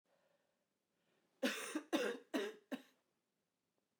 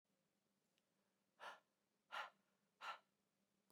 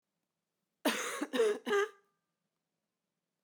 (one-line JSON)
{"three_cough_length": "4.0 s", "three_cough_amplitude": 1885, "three_cough_signal_mean_std_ratio": 0.37, "exhalation_length": "3.7 s", "exhalation_amplitude": 428, "exhalation_signal_mean_std_ratio": 0.3, "cough_length": "3.4 s", "cough_amplitude": 4182, "cough_signal_mean_std_ratio": 0.39, "survey_phase": "beta (2021-08-13 to 2022-03-07)", "age": "18-44", "gender": "Female", "wearing_mask": "No", "symptom_cough_any": true, "symptom_new_continuous_cough": true, "symptom_runny_or_blocked_nose": true, "symptom_shortness_of_breath": true, "symptom_sore_throat": true, "symptom_fatigue": true, "symptom_fever_high_temperature": true, "symptom_headache": true, "symptom_other": true, "symptom_onset": "3 days", "smoker_status": "Never smoked", "respiratory_condition_asthma": false, "respiratory_condition_other": false, "recruitment_source": "Test and Trace", "submission_delay": "1 day", "covid_test_result": "Positive", "covid_test_method": "RT-qPCR", "covid_ct_value": 16.0, "covid_ct_gene": "ORF1ab gene", "covid_ct_mean": 16.7, "covid_viral_load": "3400000 copies/ml", "covid_viral_load_category": "High viral load (>1M copies/ml)"}